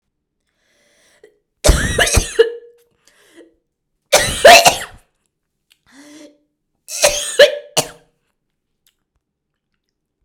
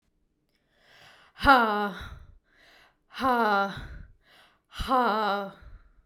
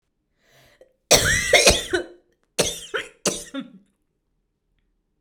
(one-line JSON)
{"three_cough_length": "10.2 s", "three_cough_amplitude": 32768, "three_cough_signal_mean_std_ratio": 0.3, "exhalation_length": "6.1 s", "exhalation_amplitude": 19388, "exhalation_signal_mean_std_ratio": 0.43, "cough_length": "5.2 s", "cough_amplitude": 32768, "cough_signal_mean_std_ratio": 0.36, "survey_phase": "beta (2021-08-13 to 2022-03-07)", "age": "18-44", "gender": "Female", "wearing_mask": "No", "symptom_fatigue": true, "smoker_status": "Never smoked", "respiratory_condition_asthma": false, "respiratory_condition_other": false, "recruitment_source": "REACT", "submission_delay": "2 days", "covid_test_result": "Negative", "covid_test_method": "RT-qPCR"}